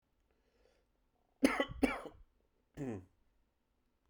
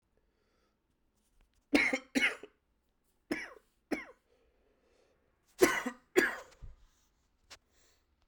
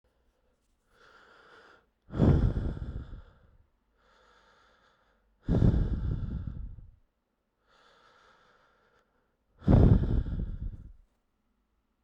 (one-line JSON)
{"cough_length": "4.1 s", "cough_amplitude": 6209, "cough_signal_mean_std_ratio": 0.27, "three_cough_length": "8.3 s", "three_cough_amplitude": 11211, "three_cough_signal_mean_std_ratio": 0.27, "exhalation_length": "12.0 s", "exhalation_amplitude": 14509, "exhalation_signal_mean_std_ratio": 0.36, "survey_phase": "beta (2021-08-13 to 2022-03-07)", "age": "18-44", "gender": "Male", "wearing_mask": "No", "symptom_cough_any": true, "symptom_runny_or_blocked_nose": true, "symptom_sore_throat": true, "symptom_fatigue": true, "symptom_change_to_sense_of_smell_or_taste": true, "symptom_loss_of_taste": true, "symptom_onset": "5 days", "smoker_status": "Current smoker (e-cigarettes or vapes only)", "respiratory_condition_asthma": false, "respiratory_condition_other": false, "recruitment_source": "Test and Trace", "submission_delay": "1 day", "covid_test_result": "Positive", "covid_test_method": "RT-qPCR"}